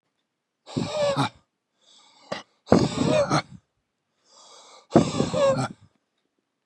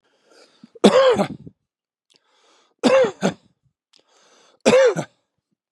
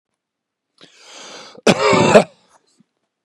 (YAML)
exhalation_length: 6.7 s
exhalation_amplitude: 31583
exhalation_signal_mean_std_ratio: 0.42
three_cough_length: 5.7 s
three_cough_amplitude: 32768
three_cough_signal_mean_std_ratio: 0.37
cough_length: 3.2 s
cough_amplitude: 32768
cough_signal_mean_std_ratio: 0.33
survey_phase: beta (2021-08-13 to 2022-03-07)
age: 45-64
gender: Male
wearing_mask: 'No'
symptom_fatigue: true
symptom_onset: 12 days
smoker_status: Ex-smoker
respiratory_condition_asthma: false
respiratory_condition_other: false
recruitment_source: REACT
submission_delay: 2 days
covid_test_result: Negative
covid_test_method: RT-qPCR
influenza_a_test_result: Negative
influenza_b_test_result: Negative